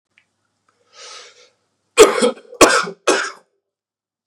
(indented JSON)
{
  "three_cough_length": "4.3 s",
  "three_cough_amplitude": 32768,
  "three_cough_signal_mean_std_ratio": 0.31,
  "survey_phase": "beta (2021-08-13 to 2022-03-07)",
  "age": "18-44",
  "gender": "Male",
  "wearing_mask": "No",
  "symptom_cough_any": true,
  "symptom_runny_or_blocked_nose": true,
  "symptom_diarrhoea": true,
  "symptom_fatigue": true,
  "symptom_headache": true,
  "smoker_status": "Never smoked",
  "respiratory_condition_asthma": false,
  "respiratory_condition_other": false,
  "recruitment_source": "Test and Trace",
  "submission_delay": "2 days",
  "covid_test_result": "Positive",
  "covid_test_method": "RT-qPCR"
}